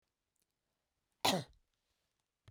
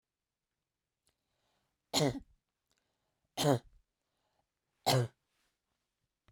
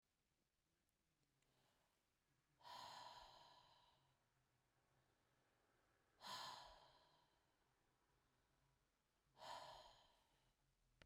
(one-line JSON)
{"cough_length": "2.5 s", "cough_amplitude": 4298, "cough_signal_mean_std_ratio": 0.21, "three_cough_length": "6.3 s", "three_cough_amplitude": 5505, "three_cough_signal_mean_std_ratio": 0.25, "exhalation_length": "11.1 s", "exhalation_amplitude": 236, "exhalation_signal_mean_std_ratio": 0.42, "survey_phase": "beta (2021-08-13 to 2022-03-07)", "age": "45-64", "gender": "Female", "wearing_mask": "No", "symptom_none": true, "smoker_status": "Never smoked", "respiratory_condition_asthma": false, "respiratory_condition_other": false, "recruitment_source": "REACT", "submission_delay": "2 days", "covid_test_result": "Negative", "covid_test_method": "RT-qPCR"}